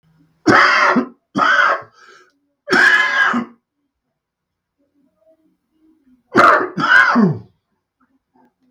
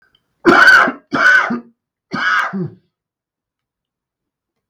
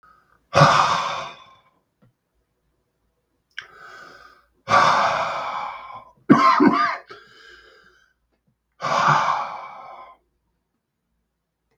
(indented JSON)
{
  "three_cough_length": "8.7 s",
  "three_cough_amplitude": 32768,
  "three_cough_signal_mean_std_ratio": 0.47,
  "cough_length": "4.7 s",
  "cough_amplitude": 32768,
  "cough_signal_mean_std_ratio": 0.43,
  "exhalation_length": "11.8 s",
  "exhalation_amplitude": 32768,
  "exhalation_signal_mean_std_ratio": 0.4,
  "survey_phase": "beta (2021-08-13 to 2022-03-07)",
  "age": "45-64",
  "gender": "Male",
  "wearing_mask": "No",
  "symptom_cough_any": true,
  "symptom_new_continuous_cough": true,
  "symptom_shortness_of_breath": true,
  "symptom_fatigue": true,
  "symptom_onset": "4 days",
  "smoker_status": "Ex-smoker",
  "respiratory_condition_asthma": false,
  "respiratory_condition_other": false,
  "recruitment_source": "Test and Trace",
  "submission_delay": "1 day",
  "covid_test_result": "Positive",
  "covid_test_method": "RT-qPCR"
}